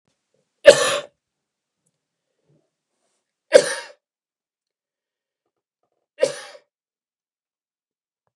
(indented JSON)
{
  "three_cough_length": "8.4 s",
  "three_cough_amplitude": 32768,
  "three_cough_signal_mean_std_ratio": 0.17,
  "survey_phase": "beta (2021-08-13 to 2022-03-07)",
  "age": "65+",
  "gender": "Male",
  "wearing_mask": "No",
  "symptom_none": true,
  "smoker_status": "Never smoked",
  "respiratory_condition_asthma": false,
  "respiratory_condition_other": false,
  "recruitment_source": "REACT",
  "submission_delay": "1 day",
  "covid_test_result": "Negative",
  "covid_test_method": "RT-qPCR",
  "influenza_a_test_result": "Negative",
  "influenza_b_test_result": "Negative"
}